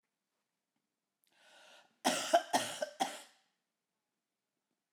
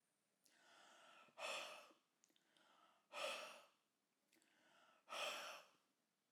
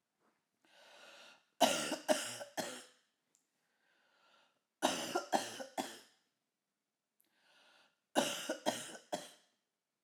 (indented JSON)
{
  "cough_length": "4.9 s",
  "cough_amplitude": 7210,
  "cough_signal_mean_std_ratio": 0.28,
  "exhalation_length": "6.3 s",
  "exhalation_amplitude": 610,
  "exhalation_signal_mean_std_ratio": 0.44,
  "three_cough_length": "10.0 s",
  "three_cough_amplitude": 6261,
  "three_cough_signal_mean_std_ratio": 0.35,
  "survey_phase": "alpha (2021-03-01 to 2021-08-12)",
  "age": "45-64",
  "gender": "Female",
  "wearing_mask": "No",
  "symptom_none": true,
  "smoker_status": "Ex-smoker",
  "respiratory_condition_asthma": false,
  "respiratory_condition_other": false,
  "recruitment_source": "REACT",
  "submission_delay": "1 day",
  "covid_test_result": "Negative",
  "covid_test_method": "RT-qPCR"
}